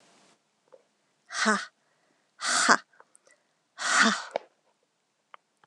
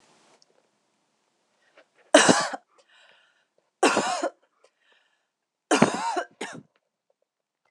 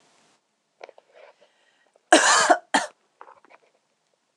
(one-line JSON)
{"exhalation_length": "5.7 s", "exhalation_amplitude": 24587, "exhalation_signal_mean_std_ratio": 0.32, "three_cough_length": "7.7 s", "three_cough_amplitude": 26024, "three_cough_signal_mean_std_ratio": 0.29, "cough_length": "4.4 s", "cough_amplitude": 26028, "cough_signal_mean_std_ratio": 0.28, "survey_phase": "alpha (2021-03-01 to 2021-08-12)", "age": "18-44", "gender": "Female", "wearing_mask": "No", "symptom_cough_any": true, "symptom_fatigue": true, "symptom_fever_high_temperature": true, "symptom_headache": true, "smoker_status": "Ex-smoker", "respiratory_condition_asthma": true, "respiratory_condition_other": false, "recruitment_source": "Test and Trace", "submission_delay": "2 days", "covid_test_result": "Positive", "covid_test_method": "RT-qPCR", "covid_ct_value": 15.9, "covid_ct_gene": "ORF1ab gene", "covid_ct_mean": 16.4, "covid_viral_load": "4200000 copies/ml", "covid_viral_load_category": "High viral load (>1M copies/ml)"}